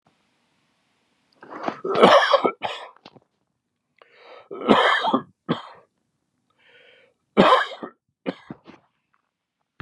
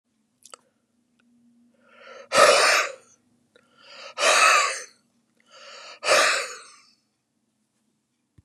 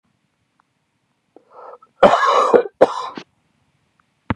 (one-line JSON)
{"three_cough_length": "9.8 s", "three_cough_amplitude": 32768, "three_cough_signal_mean_std_ratio": 0.33, "exhalation_length": "8.4 s", "exhalation_amplitude": 24639, "exhalation_signal_mean_std_ratio": 0.36, "cough_length": "4.4 s", "cough_amplitude": 32768, "cough_signal_mean_std_ratio": 0.33, "survey_phase": "beta (2021-08-13 to 2022-03-07)", "age": "65+", "gender": "Male", "wearing_mask": "No", "symptom_none": true, "symptom_onset": "12 days", "smoker_status": "Never smoked", "respiratory_condition_asthma": false, "respiratory_condition_other": false, "recruitment_source": "REACT", "submission_delay": "1 day", "covid_test_result": "Negative", "covid_test_method": "RT-qPCR", "influenza_a_test_result": "Negative", "influenza_b_test_result": "Negative"}